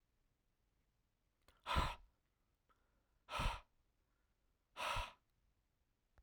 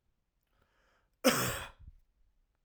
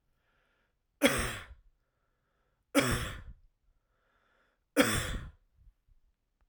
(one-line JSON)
{"exhalation_length": "6.2 s", "exhalation_amplitude": 2013, "exhalation_signal_mean_std_ratio": 0.3, "cough_length": "2.6 s", "cough_amplitude": 8257, "cough_signal_mean_std_ratio": 0.28, "three_cough_length": "6.5 s", "three_cough_amplitude": 13589, "three_cough_signal_mean_std_ratio": 0.32, "survey_phase": "alpha (2021-03-01 to 2021-08-12)", "age": "18-44", "gender": "Male", "wearing_mask": "No", "symptom_none": true, "smoker_status": "Never smoked", "respiratory_condition_asthma": false, "respiratory_condition_other": false, "recruitment_source": "REACT", "submission_delay": "2 days", "covid_test_result": "Negative", "covid_test_method": "RT-qPCR"}